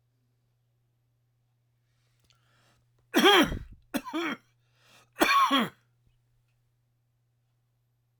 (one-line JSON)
{"three_cough_length": "8.2 s", "three_cough_amplitude": 16399, "three_cough_signal_mean_std_ratio": 0.29, "survey_phase": "alpha (2021-03-01 to 2021-08-12)", "age": "65+", "gender": "Male", "wearing_mask": "No", "symptom_cough_any": true, "smoker_status": "Ex-smoker", "respiratory_condition_asthma": false, "respiratory_condition_other": true, "recruitment_source": "REACT", "submission_delay": "2 days", "covid_test_result": "Negative", "covid_test_method": "RT-qPCR"}